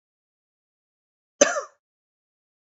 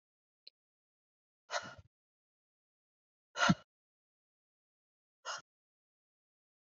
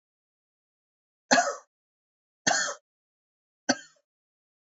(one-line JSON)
{"cough_length": "2.7 s", "cough_amplitude": 26342, "cough_signal_mean_std_ratio": 0.16, "exhalation_length": "6.7 s", "exhalation_amplitude": 5489, "exhalation_signal_mean_std_ratio": 0.17, "three_cough_length": "4.6 s", "three_cough_amplitude": 15453, "three_cough_signal_mean_std_ratio": 0.25, "survey_phase": "beta (2021-08-13 to 2022-03-07)", "age": "18-44", "gender": "Male", "wearing_mask": "No", "symptom_cough_any": true, "symptom_runny_or_blocked_nose": true, "symptom_sore_throat": true, "symptom_headache": true, "symptom_onset": "2 days", "smoker_status": "Never smoked", "respiratory_condition_asthma": false, "respiratory_condition_other": false, "recruitment_source": "REACT", "submission_delay": "1 day", "covid_test_result": "Positive", "covid_test_method": "RT-qPCR", "covid_ct_value": 21.6, "covid_ct_gene": "E gene", "influenza_a_test_result": "Negative", "influenza_b_test_result": "Negative"}